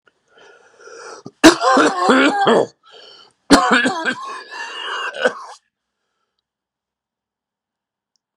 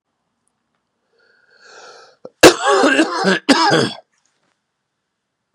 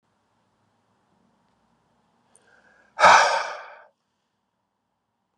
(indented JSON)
{
  "three_cough_length": "8.4 s",
  "three_cough_amplitude": 32768,
  "three_cough_signal_mean_std_ratio": 0.4,
  "cough_length": "5.5 s",
  "cough_amplitude": 32768,
  "cough_signal_mean_std_ratio": 0.36,
  "exhalation_length": "5.4 s",
  "exhalation_amplitude": 28838,
  "exhalation_signal_mean_std_ratio": 0.22,
  "survey_phase": "beta (2021-08-13 to 2022-03-07)",
  "age": "45-64",
  "gender": "Male",
  "wearing_mask": "No",
  "symptom_cough_any": true,
  "symptom_runny_or_blocked_nose": true,
  "symptom_sore_throat": true,
  "symptom_fatigue": true,
  "symptom_headache": true,
  "symptom_other": true,
  "symptom_onset": "2 days",
  "smoker_status": "Never smoked",
  "respiratory_condition_asthma": false,
  "respiratory_condition_other": false,
  "recruitment_source": "Test and Trace",
  "submission_delay": "1 day",
  "covid_test_result": "Positive",
  "covid_test_method": "RT-qPCR",
  "covid_ct_value": 21.9,
  "covid_ct_gene": "ORF1ab gene"
}